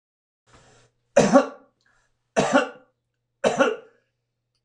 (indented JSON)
{
  "three_cough_length": "4.6 s",
  "three_cough_amplitude": 24137,
  "three_cough_signal_mean_std_ratio": 0.33,
  "survey_phase": "alpha (2021-03-01 to 2021-08-12)",
  "age": "65+",
  "gender": "Male",
  "wearing_mask": "No",
  "symptom_cough_any": true,
  "symptom_fatigue": true,
  "symptom_onset": "6 days",
  "smoker_status": "Never smoked",
  "respiratory_condition_asthma": false,
  "respiratory_condition_other": false,
  "recruitment_source": "REACT",
  "submission_delay": "1 day",
  "covid_test_result": "Negative",
  "covid_test_method": "RT-qPCR"
}